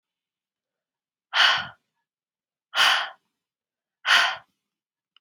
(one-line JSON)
{"exhalation_length": "5.2 s", "exhalation_amplitude": 18554, "exhalation_signal_mean_std_ratio": 0.32, "survey_phase": "beta (2021-08-13 to 2022-03-07)", "age": "18-44", "gender": "Female", "wearing_mask": "No", "symptom_none": true, "smoker_status": "Never smoked", "respiratory_condition_asthma": false, "respiratory_condition_other": false, "recruitment_source": "Test and Trace", "submission_delay": "2 days", "covid_test_result": "Negative", "covid_test_method": "RT-qPCR"}